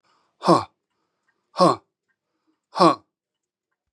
exhalation_length: 3.9 s
exhalation_amplitude: 30698
exhalation_signal_mean_std_ratio: 0.27
survey_phase: beta (2021-08-13 to 2022-03-07)
age: 65+
gender: Male
wearing_mask: 'No'
symptom_none: true
smoker_status: Ex-smoker
respiratory_condition_asthma: false
respiratory_condition_other: false
recruitment_source: REACT
submission_delay: 2 days
covid_test_result: Negative
covid_test_method: RT-qPCR
influenza_a_test_result: Negative
influenza_b_test_result: Negative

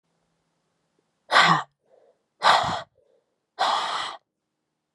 exhalation_length: 4.9 s
exhalation_amplitude: 25449
exhalation_signal_mean_std_ratio: 0.36
survey_phase: beta (2021-08-13 to 2022-03-07)
age: 18-44
gender: Female
wearing_mask: 'No'
symptom_headache: true
smoker_status: Never smoked
respiratory_condition_asthma: false
respiratory_condition_other: false
recruitment_source: Test and Trace
submission_delay: 1 day
covid_test_result: Positive
covid_test_method: RT-qPCR
covid_ct_value: 32.5
covid_ct_gene: ORF1ab gene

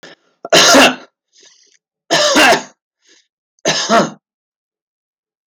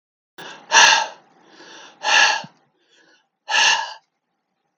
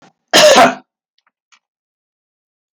three_cough_length: 5.5 s
three_cough_amplitude: 32768
three_cough_signal_mean_std_ratio: 0.42
exhalation_length: 4.8 s
exhalation_amplitude: 32768
exhalation_signal_mean_std_ratio: 0.39
cough_length: 2.7 s
cough_amplitude: 32768
cough_signal_mean_std_ratio: 0.34
survey_phase: beta (2021-08-13 to 2022-03-07)
age: 45-64
gender: Male
wearing_mask: 'No'
symptom_none: true
smoker_status: Never smoked
respiratory_condition_asthma: false
respiratory_condition_other: false
recruitment_source: REACT
submission_delay: 3 days
covid_test_result: Negative
covid_test_method: RT-qPCR
influenza_a_test_result: Negative
influenza_b_test_result: Negative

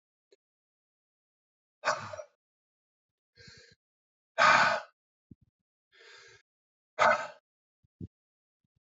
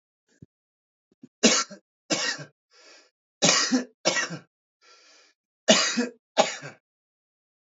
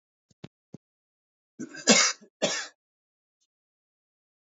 exhalation_length: 8.9 s
exhalation_amplitude: 12657
exhalation_signal_mean_std_ratio: 0.24
three_cough_length: 7.8 s
three_cough_amplitude: 23841
three_cough_signal_mean_std_ratio: 0.35
cough_length: 4.4 s
cough_amplitude: 22205
cough_signal_mean_std_ratio: 0.24
survey_phase: beta (2021-08-13 to 2022-03-07)
age: 45-64
gender: Male
wearing_mask: 'No'
symptom_cough_any: true
symptom_runny_or_blocked_nose: true
symptom_fatigue: true
symptom_change_to_sense_of_smell_or_taste: true
symptom_loss_of_taste: true
symptom_onset: 3 days
smoker_status: Ex-smoker
respiratory_condition_asthma: false
respiratory_condition_other: false
recruitment_source: Test and Trace
submission_delay: 1 day
covid_test_result: Positive
covid_test_method: RT-qPCR
covid_ct_value: 26.2
covid_ct_gene: ORF1ab gene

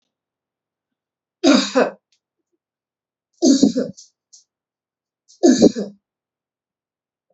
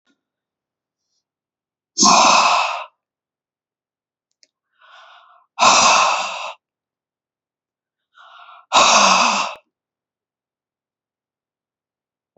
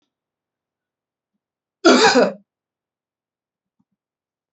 three_cough_length: 7.3 s
three_cough_amplitude: 32767
three_cough_signal_mean_std_ratio: 0.3
exhalation_length: 12.4 s
exhalation_amplitude: 30598
exhalation_signal_mean_std_ratio: 0.35
cough_length: 4.5 s
cough_amplitude: 28963
cough_signal_mean_std_ratio: 0.25
survey_phase: beta (2021-08-13 to 2022-03-07)
age: 65+
gender: Female
wearing_mask: 'No'
symptom_runny_or_blocked_nose: true
symptom_sore_throat: true
smoker_status: Ex-smoker
respiratory_condition_asthma: false
respiratory_condition_other: false
recruitment_source: REACT
submission_delay: 1 day
covid_test_result: Negative
covid_test_method: RT-qPCR
influenza_a_test_result: Negative
influenza_b_test_result: Negative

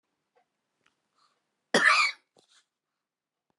cough_length: 3.6 s
cough_amplitude: 13337
cough_signal_mean_std_ratio: 0.26
survey_phase: beta (2021-08-13 to 2022-03-07)
age: 65+
gender: Female
wearing_mask: 'No'
symptom_shortness_of_breath: true
symptom_fatigue: true
smoker_status: Ex-smoker
respiratory_condition_asthma: true
respiratory_condition_other: false
recruitment_source: REACT
submission_delay: 2 days
covid_test_result: Negative
covid_test_method: RT-qPCR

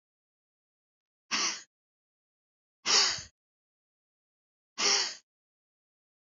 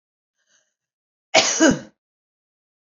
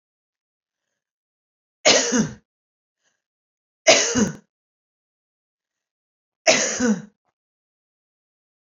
exhalation_length: 6.2 s
exhalation_amplitude: 8425
exhalation_signal_mean_std_ratio: 0.29
cough_length: 3.0 s
cough_amplitude: 32767
cough_signal_mean_std_ratio: 0.28
three_cough_length: 8.6 s
three_cough_amplitude: 30254
three_cough_signal_mean_std_ratio: 0.3
survey_phase: beta (2021-08-13 to 2022-03-07)
age: 65+
gender: Female
wearing_mask: 'No'
symptom_none: true
smoker_status: Ex-smoker
respiratory_condition_asthma: false
respiratory_condition_other: false
recruitment_source: REACT
submission_delay: 1 day
covid_test_result: Negative
covid_test_method: RT-qPCR
influenza_a_test_result: Negative
influenza_b_test_result: Negative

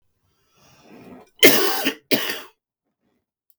cough_length: 3.6 s
cough_amplitude: 32768
cough_signal_mean_std_ratio: 0.32
survey_phase: beta (2021-08-13 to 2022-03-07)
age: 45-64
gender: Male
wearing_mask: 'No'
symptom_none: true
symptom_onset: 3 days
smoker_status: Current smoker (11 or more cigarettes per day)
respiratory_condition_asthma: true
respiratory_condition_other: false
recruitment_source: REACT
submission_delay: 2 days
covid_test_result: Negative
covid_test_method: RT-qPCR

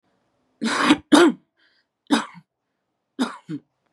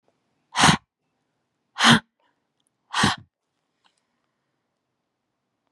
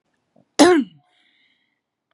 three_cough_length: 3.9 s
three_cough_amplitude: 30047
three_cough_signal_mean_std_ratio: 0.34
exhalation_length: 5.7 s
exhalation_amplitude: 26308
exhalation_signal_mean_std_ratio: 0.24
cough_length: 2.1 s
cough_amplitude: 32767
cough_signal_mean_std_ratio: 0.28
survey_phase: beta (2021-08-13 to 2022-03-07)
age: 45-64
gender: Female
wearing_mask: 'No'
symptom_abdominal_pain: true
symptom_diarrhoea: true
symptom_fatigue: true
symptom_onset: 11 days
smoker_status: Current smoker (1 to 10 cigarettes per day)
respiratory_condition_asthma: false
respiratory_condition_other: false
recruitment_source: REACT
submission_delay: 3 days
covid_test_result: Negative
covid_test_method: RT-qPCR
influenza_a_test_result: Negative
influenza_b_test_result: Negative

